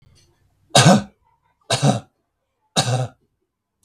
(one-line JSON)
{"three_cough_length": "3.8 s", "three_cough_amplitude": 32768, "three_cough_signal_mean_std_ratio": 0.35, "survey_phase": "beta (2021-08-13 to 2022-03-07)", "age": "45-64", "gender": "Male", "wearing_mask": "No", "symptom_none": true, "smoker_status": "Never smoked", "respiratory_condition_asthma": false, "respiratory_condition_other": false, "recruitment_source": "REACT", "submission_delay": "2 days", "covid_test_result": "Negative", "covid_test_method": "RT-qPCR", "influenza_a_test_result": "Negative", "influenza_b_test_result": "Negative"}